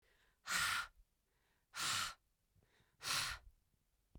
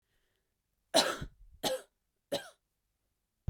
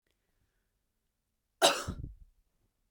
{
  "exhalation_length": "4.2 s",
  "exhalation_amplitude": 1921,
  "exhalation_signal_mean_std_ratio": 0.44,
  "three_cough_length": "3.5 s",
  "three_cough_amplitude": 10095,
  "three_cough_signal_mean_std_ratio": 0.29,
  "cough_length": "2.9 s",
  "cough_amplitude": 11503,
  "cough_signal_mean_std_ratio": 0.23,
  "survey_phase": "beta (2021-08-13 to 2022-03-07)",
  "age": "18-44",
  "gender": "Female",
  "wearing_mask": "No",
  "symptom_cough_any": true,
  "symptom_runny_or_blocked_nose": true,
  "symptom_other": true,
  "symptom_onset": "12 days",
  "smoker_status": "Current smoker (11 or more cigarettes per day)",
  "respiratory_condition_asthma": false,
  "respiratory_condition_other": false,
  "recruitment_source": "REACT",
  "submission_delay": "4 days",
  "covid_test_result": "Negative",
  "covid_test_method": "RT-qPCR",
  "influenza_a_test_result": "Negative",
  "influenza_b_test_result": "Negative"
}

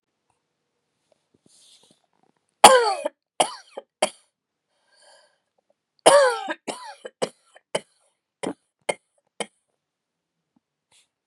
{
  "cough_length": "11.3 s",
  "cough_amplitude": 32768,
  "cough_signal_mean_std_ratio": 0.22,
  "survey_phase": "beta (2021-08-13 to 2022-03-07)",
  "age": "45-64",
  "gender": "Female",
  "wearing_mask": "Yes",
  "symptom_cough_any": true,
  "symptom_sore_throat": true,
  "symptom_fatigue": true,
  "symptom_headache": true,
  "smoker_status": "Never smoked",
  "respiratory_condition_asthma": false,
  "respiratory_condition_other": false,
  "recruitment_source": "Test and Trace",
  "submission_delay": "1 day",
  "covid_test_result": "Positive",
  "covid_test_method": "LFT"
}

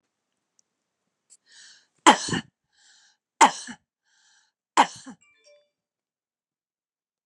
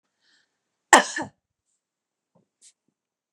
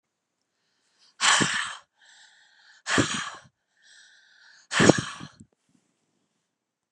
{
  "three_cough_length": "7.3 s",
  "three_cough_amplitude": 29848,
  "three_cough_signal_mean_std_ratio": 0.18,
  "cough_length": "3.3 s",
  "cough_amplitude": 32767,
  "cough_signal_mean_std_ratio": 0.16,
  "exhalation_length": "6.9 s",
  "exhalation_amplitude": 32513,
  "exhalation_signal_mean_std_ratio": 0.3,
  "survey_phase": "beta (2021-08-13 to 2022-03-07)",
  "age": "45-64",
  "gender": "Female",
  "wearing_mask": "No",
  "symptom_none": true,
  "smoker_status": "Never smoked",
  "respiratory_condition_asthma": false,
  "respiratory_condition_other": false,
  "recruitment_source": "REACT",
  "submission_delay": "1 day",
  "covid_test_result": "Negative",
  "covid_test_method": "RT-qPCR"
}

